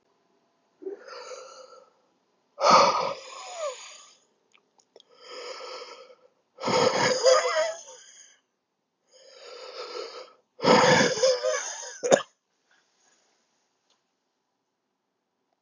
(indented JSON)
{
  "exhalation_length": "15.6 s",
  "exhalation_amplitude": 26773,
  "exhalation_signal_mean_std_ratio": 0.38,
  "survey_phase": "beta (2021-08-13 to 2022-03-07)",
  "age": "18-44",
  "gender": "Male",
  "wearing_mask": "No",
  "symptom_cough_any": true,
  "symptom_runny_or_blocked_nose": true,
  "symptom_diarrhoea": true,
  "symptom_fatigue": true,
  "symptom_fever_high_temperature": true,
  "symptom_headache": true,
  "symptom_change_to_sense_of_smell_or_taste": true,
  "symptom_loss_of_taste": true,
  "smoker_status": "Ex-smoker",
  "recruitment_source": "Test and Trace",
  "submission_delay": "2 days",
  "covid_test_result": "Positive",
  "covid_test_method": "RT-qPCR",
  "covid_ct_value": 21.2,
  "covid_ct_gene": "ORF1ab gene"
}